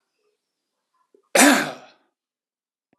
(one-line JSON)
{"cough_length": "3.0 s", "cough_amplitude": 30534, "cough_signal_mean_std_ratio": 0.26, "survey_phase": "alpha (2021-03-01 to 2021-08-12)", "age": "65+", "gender": "Male", "wearing_mask": "No", "symptom_none": true, "smoker_status": "Never smoked", "respiratory_condition_asthma": false, "respiratory_condition_other": false, "recruitment_source": "REACT", "submission_delay": "2 days", "covid_test_result": "Negative", "covid_test_method": "RT-qPCR"}